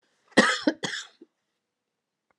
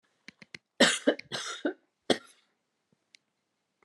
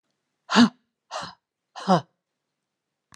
{"cough_length": "2.4 s", "cough_amplitude": 21067, "cough_signal_mean_std_ratio": 0.29, "three_cough_length": "3.8 s", "three_cough_amplitude": 13756, "three_cough_signal_mean_std_ratio": 0.27, "exhalation_length": "3.2 s", "exhalation_amplitude": 22142, "exhalation_signal_mean_std_ratio": 0.26, "survey_phase": "alpha (2021-03-01 to 2021-08-12)", "age": "65+", "gender": "Female", "wearing_mask": "No", "symptom_none": true, "smoker_status": "Ex-smoker", "respiratory_condition_asthma": true, "respiratory_condition_other": false, "recruitment_source": "REACT", "submission_delay": "1 day", "covid_test_result": "Negative", "covid_test_method": "RT-qPCR"}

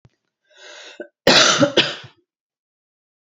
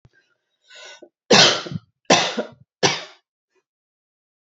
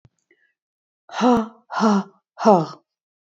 {"cough_length": "3.2 s", "cough_amplitude": 32138, "cough_signal_mean_std_ratio": 0.35, "three_cough_length": "4.4 s", "three_cough_amplitude": 32768, "three_cough_signal_mean_std_ratio": 0.32, "exhalation_length": "3.3 s", "exhalation_amplitude": 26662, "exhalation_signal_mean_std_ratio": 0.39, "survey_phase": "beta (2021-08-13 to 2022-03-07)", "age": "18-44", "gender": "Female", "wearing_mask": "No", "symptom_cough_any": true, "symptom_runny_or_blocked_nose": true, "smoker_status": "Never smoked", "respiratory_condition_asthma": false, "respiratory_condition_other": false, "recruitment_source": "REACT", "submission_delay": "2 days", "covid_test_result": "Negative", "covid_test_method": "RT-qPCR"}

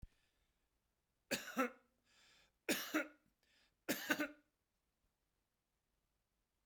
{"three_cough_length": "6.7 s", "three_cough_amplitude": 2972, "three_cough_signal_mean_std_ratio": 0.29, "survey_phase": "beta (2021-08-13 to 2022-03-07)", "age": "65+", "gender": "Male", "wearing_mask": "No", "symptom_none": true, "smoker_status": "Ex-smoker", "respiratory_condition_asthma": false, "respiratory_condition_other": false, "recruitment_source": "REACT", "submission_delay": "1 day", "covid_test_result": "Negative", "covid_test_method": "RT-qPCR"}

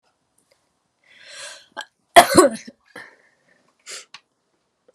{"cough_length": "4.9 s", "cough_amplitude": 32768, "cough_signal_mean_std_ratio": 0.2, "survey_phase": "alpha (2021-03-01 to 2021-08-12)", "age": "45-64", "gender": "Female", "wearing_mask": "Yes", "symptom_shortness_of_breath": true, "symptom_fatigue": true, "symptom_onset": "12 days", "smoker_status": "Ex-smoker", "respiratory_condition_asthma": false, "respiratory_condition_other": false, "recruitment_source": "REACT", "submission_delay": "1 day", "covid_test_result": "Negative", "covid_test_method": "RT-qPCR"}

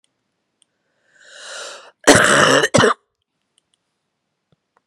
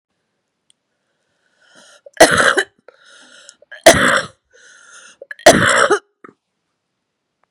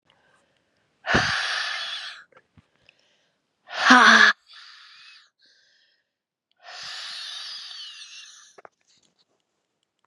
{"cough_length": "4.9 s", "cough_amplitude": 32768, "cough_signal_mean_std_ratio": 0.33, "three_cough_length": "7.5 s", "three_cough_amplitude": 32768, "three_cough_signal_mean_std_ratio": 0.31, "exhalation_length": "10.1 s", "exhalation_amplitude": 32577, "exhalation_signal_mean_std_ratio": 0.29, "survey_phase": "beta (2021-08-13 to 2022-03-07)", "age": "45-64", "gender": "Female", "wearing_mask": "No", "symptom_cough_any": true, "symptom_runny_or_blocked_nose": true, "symptom_shortness_of_breath": true, "symptom_sore_throat": true, "symptom_fatigue": true, "symptom_fever_high_temperature": true, "symptom_headache": true, "symptom_change_to_sense_of_smell_or_taste": true, "smoker_status": "Never smoked", "respiratory_condition_asthma": false, "respiratory_condition_other": false, "recruitment_source": "Test and Trace", "submission_delay": "2 days", "covid_test_result": "Positive", "covid_test_method": "RT-qPCR"}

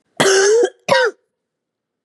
{"cough_length": "2.0 s", "cough_amplitude": 31283, "cough_signal_mean_std_ratio": 0.55, "survey_phase": "beta (2021-08-13 to 2022-03-07)", "age": "45-64", "gender": "Female", "wearing_mask": "No", "symptom_cough_any": true, "symptom_runny_or_blocked_nose": true, "symptom_fatigue": true, "symptom_change_to_sense_of_smell_or_taste": true, "symptom_loss_of_taste": true, "symptom_onset": "6 days", "smoker_status": "Ex-smoker", "respiratory_condition_asthma": false, "respiratory_condition_other": false, "recruitment_source": "REACT", "submission_delay": "0 days", "covid_test_result": "Positive", "covid_test_method": "RT-qPCR", "covid_ct_value": 18.7, "covid_ct_gene": "E gene", "influenza_a_test_result": "Negative", "influenza_b_test_result": "Negative"}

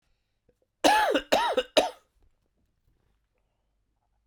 {"three_cough_length": "4.3 s", "three_cough_amplitude": 16372, "three_cough_signal_mean_std_ratio": 0.34, "survey_phase": "beta (2021-08-13 to 2022-03-07)", "age": "45-64", "gender": "Male", "wearing_mask": "No", "symptom_cough_any": true, "symptom_shortness_of_breath": true, "symptom_sore_throat": true, "symptom_fatigue": true, "symptom_headache": true, "symptom_change_to_sense_of_smell_or_taste": true, "smoker_status": "Ex-smoker", "respiratory_condition_asthma": false, "respiratory_condition_other": false, "recruitment_source": "Test and Trace", "submission_delay": "1 day", "covid_test_result": "Positive", "covid_test_method": "RT-qPCR", "covid_ct_value": 19.7, "covid_ct_gene": "ORF1ab gene", "covid_ct_mean": 20.2, "covid_viral_load": "240000 copies/ml", "covid_viral_load_category": "Low viral load (10K-1M copies/ml)"}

